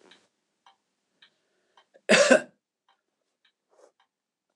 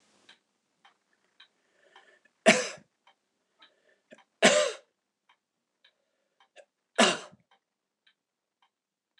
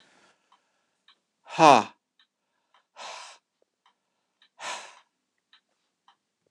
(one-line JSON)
{"cough_length": "4.6 s", "cough_amplitude": 21961, "cough_signal_mean_std_ratio": 0.2, "three_cough_length": "9.2 s", "three_cough_amplitude": 19554, "three_cough_signal_mean_std_ratio": 0.21, "exhalation_length": "6.5 s", "exhalation_amplitude": 25960, "exhalation_signal_mean_std_ratio": 0.16, "survey_phase": "beta (2021-08-13 to 2022-03-07)", "age": "65+", "gender": "Male", "wearing_mask": "No", "symptom_none": true, "smoker_status": "Never smoked", "respiratory_condition_asthma": false, "respiratory_condition_other": false, "recruitment_source": "REACT", "submission_delay": "1 day", "covid_test_result": "Negative", "covid_test_method": "RT-qPCR", "influenza_a_test_result": "Negative", "influenza_b_test_result": "Negative"}